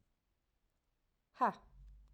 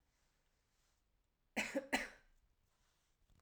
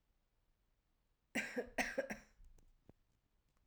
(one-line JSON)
{"exhalation_length": "2.1 s", "exhalation_amplitude": 2845, "exhalation_signal_mean_std_ratio": 0.22, "cough_length": "3.4 s", "cough_amplitude": 2933, "cough_signal_mean_std_ratio": 0.27, "three_cough_length": "3.7 s", "three_cough_amplitude": 2065, "three_cough_signal_mean_std_ratio": 0.34, "survey_phase": "alpha (2021-03-01 to 2021-08-12)", "age": "18-44", "gender": "Female", "wearing_mask": "No", "symptom_none": true, "smoker_status": "Never smoked", "respiratory_condition_asthma": false, "respiratory_condition_other": false, "recruitment_source": "REACT", "submission_delay": "1 day", "covid_test_result": "Negative", "covid_test_method": "RT-qPCR"}